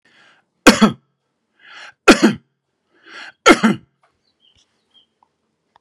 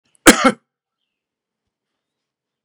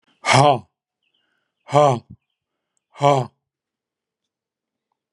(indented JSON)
{
  "three_cough_length": "5.8 s",
  "three_cough_amplitude": 32768,
  "three_cough_signal_mean_std_ratio": 0.26,
  "cough_length": "2.6 s",
  "cough_amplitude": 32768,
  "cough_signal_mean_std_ratio": 0.2,
  "exhalation_length": "5.1 s",
  "exhalation_amplitude": 32377,
  "exhalation_signal_mean_std_ratio": 0.3,
  "survey_phase": "beta (2021-08-13 to 2022-03-07)",
  "age": "45-64",
  "gender": "Male",
  "wearing_mask": "No",
  "symptom_sore_throat": true,
  "smoker_status": "Never smoked",
  "respiratory_condition_asthma": false,
  "respiratory_condition_other": false,
  "recruitment_source": "REACT",
  "submission_delay": "1 day",
  "covid_test_result": "Negative",
  "covid_test_method": "RT-qPCR",
  "influenza_a_test_result": "Negative",
  "influenza_b_test_result": "Negative"
}